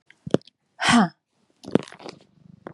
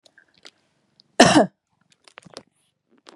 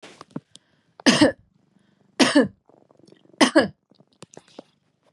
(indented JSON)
{
  "exhalation_length": "2.7 s",
  "exhalation_amplitude": 28190,
  "exhalation_signal_mean_std_ratio": 0.29,
  "cough_length": "3.2 s",
  "cough_amplitude": 32767,
  "cough_signal_mean_std_ratio": 0.22,
  "three_cough_length": "5.1 s",
  "three_cough_amplitude": 30247,
  "three_cough_signal_mean_std_ratio": 0.29,
  "survey_phase": "beta (2021-08-13 to 2022-03-07)",
  "age": "65+",
  "gender": "Female",
  "wearing_mask": "No",
  "symptom_cough_any": true,
  "smoker_status": "Never smoked",
  "respiratory_condition_asthma": false,
  "respiratory_condition_other": false,
  "recruitment_source": "REACT",
  "submission_delay": "1 day",
  "covid_test_result": "Negative",
  "covid_test_method": "RT-qPCR",
  "influenza_a_test_result": "Negative",
  "influenza_b_test_result": "Negative"
}